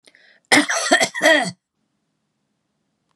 {"cough_length": "3.2 s", "cough_amplitude": 32562, "cough_signal_mean_std_ratio": 0.39, "survey_phase": "beta (2021-08-13 to 2022-03-07)", "age": "65+", "gender": "Female", "wearing_mask": "No", "symptom_none": true, "smoker_status": "Never smoked", "respiratory_condition_asthma": false, "respiratory_condition_other": false, "recruitment_source": "REACT", "submission_delay": "2 days", "covid_test_result": "Negative", "covid_test_method": "RT-qPCR", "influenza_a_test_result": "Negative", "influenza_b_test_result": "Negative"}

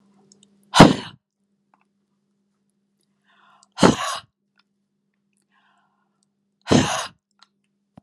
{"exhalation_length": "8.0 s", "exhalation_amplitude": 32768, "exhalation_signal_mean_std_ratio": 0.21, "survey_phase": "alpha (2021-03-01 to 2021-08-12)", "age": "65+", "gender": "Female", "wearing_mask": "No", "symptom_none": true, "smoker_status": "Never smoked", "respiratory_condition_asthma": false, "respiratory_condition_other": false, "recruitment_source": "REACT", "submission_delay": "2 days", "covid_test_result": "Negative", "covid_test_method": "RT-qPCR"}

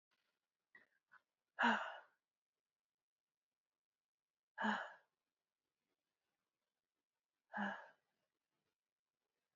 {"exhalation_length": "9.6 s", "exhalation_amplitude": 2511, "exhalation_signal_mean_std_ratio": 0.22, "survey_phase": "beta (2021-08-13 to 2022-03-07)", "age": "18-44", "gender": "Female", "wearing_mask": "No", "symptom_none": true, "smoker_status": "Never smoked", "respiratory_condition_asthma": true, "respiratory_condition_other": false, "recruitment_source": "REACT", "submission_delay": "3 days", "covid_test_result": "Negative", "covid_test_method": "RT-qPCR"}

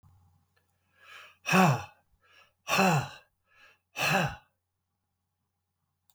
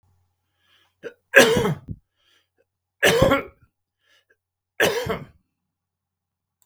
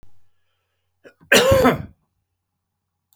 {"exhalation_length": "6.1 s", "exhalation_amplitude": 13456, "exhalation_signal_mean_std_ratio": 0.34, "three_cough_length": "6.7 s", "three_cough_amplitude": 32766, "three_cough_signal_mean_std_ratio": 0.31, "cough_length": "3.2 s", "cough_amplitude": 31143, "cough_signal_mean_std_ratio": 0.33, "survey_phase": "beta (2021-08-13 to 2022-03-07)", "age": "65+", "gender": "Male", "wearing_mask": "No", "symptom_none": true, "smoker_status": "Never smoked", "respiratory_condition_asthma": false, "respiratory_condition_other": false, "recruitment_source": "REACT", "submission_delay": "2 days", "covid_test_result": "Negative", "covid_test_method": "RT-qPCR", "influenza_a_test_result": "Negative", "influenza_b_test_result": "Negative"}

